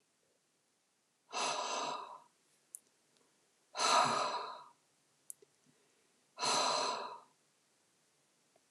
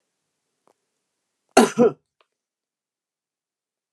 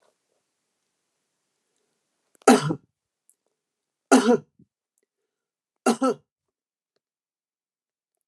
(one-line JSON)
{"exhalation_length": "8.7 s", "exhalation_amplitude": 4826, "exhalation_signal_mean_std_ratio": 0.41, "cough_length": "3.9 s", "cough_amplitude": 29204, "cough_signal_mean_std_ratio": 0.19, "three_cough_length": "8.3 s", "three_cough_amplitude": 28146, "three_cough_signal_mean_std_ratio": 0.22, "survey_phase": "alpha (2021-03-01 to 2021-08-12)", "age": "65+", "gender": "Male", "wearing_mask": "No", "symptom_none": true, "smoker_status": "Never smoked", "respiratory_condition_asthma": false, "respiratory_condition_other": false, "recruitment_source": "REACT", "submission_delay": "3 days", "covid_test_result": "Negative", "covid_test_method": "RT-qPCR"}